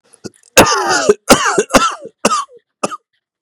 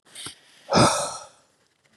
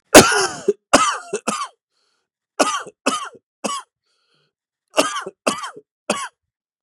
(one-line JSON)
{"cough_length": "3.4 s", "cough_amplitude": 32768, "cough_signal_mean_std_ratio": 0.49, "exhalation_length": "2.0 s", "exhalation_amplitude": 19557, "exhalation_signal_mean_std_ratio": 0.38, "three_cough_length": "6.8 s", "three_cough_amplitude": 32768, "three_cough_signal_mean_std_ratio": 0.34, "survey_phase": "beta (2021-08-13 to 2022-03-07)", "age": "18-44", "gender": "Male", "wearing_mask": "No", "symptom_cough_any": true, "symptom_runny_or_blocked_nose": true, "symptom_shortness_of_breath": true, "symptom_fatigue": true, "symptom_fever_high_temperature": true, "symptom_onset": "4 days", "smoker_status": "Never smoked", "respiratory_condition_asthma": false, "respiratory_condition_other": false, "recruitment_source": "Test and Trace", "submission_delay": "2 days", "covid_test_result": "Positive", "covid_test_method": "RT-qPCR"}